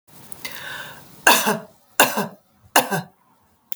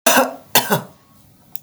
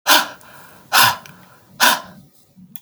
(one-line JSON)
{"three_cough_length": "3.8 s", "three_cough_amplitude": 32768, "three_cough_signal_mean_std_ratio": 0.37, "cough_length": "1.6 s", "cough_amplitude": 32768, "cough_signal_mean_std_ratio": 0.43, "exhalation_length": "2.8 s", "exhalation_amplitude": 32768, "exhalation_signal_mean_std_ratio": 0.4, "survey_phase": "alpha (2021-03-01 to 2021-08-12)", "age": "65+", "gender": "Female", "wearing_mask": "No", "symptom_none": true, "smoker_status": "Never smoked", "respiratory_condition_asthma": false, "respiratory_condition_other": false, "recruitment_source": "REACT", "submission_delay": "1 day", "covid_test_result": "Negative", "covid_test_method": "RT-qPCR"}